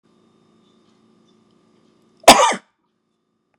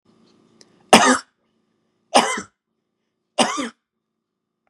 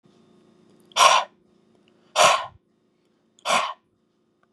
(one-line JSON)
{"cough_length": "3.6 s", "cough_amplitude": 32768, "cough_signal_mean_std_ratio": 0.2, "three_cough_length": "4.7 s", "three_cough_amplitude": 32768, "three_cough_signal_mean_std_ratio": 0.27, "exhalation_length": "4.5 s", "exhalation_amplitude": 29626, "exhalation_signal_mean_std_ratio": 0.32, "survey_phase": "beta (2021-08-13 to 2022-03-07)", "age": "45-64", "gender": "Male", "wearing_mask": "No", "symptom_none": true, "smoker_status": "Never smoked", "respiratory_condition_asthma": false, "respiratory_condition_other": false, "recruitment_source": "REACT", "submission_delay": "1 day", "covid_test_result": "Negative", "covid_test_method": "RT-qPCR"}